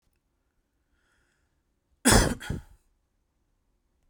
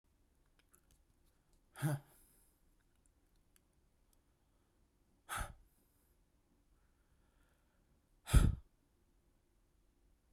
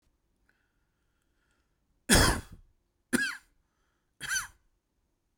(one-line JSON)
{"cough_length": "4.1 s", "cough_amplitude": 18152, "cough_signal_mean_std_ratio": 0.23, "exhalation_length": "10.3 s", "exhalation_amplitude": 5052, "exhalation_signal_mean_std_ratio": 0.18, "three_cough_length": "5.4 s", "three_cough_amplitude": 17098, "three_cough_signal_mean_std_ratio": 0.26, "survey_phase": "beta (2021-08-13 to 2022-03-07)", "age": "18-44", "gender": "Male", "wearing_mask": "No", "symptom_none": true, "smoker_status": "Never smoked", "respiratory_condition_asthma": false, "respiratory_condition_other": false, "recruitment_source": "REACT", "submission_delay": "1 day", "covid_test_result": "Negative", "covid_test_method": "RT-qPCR"}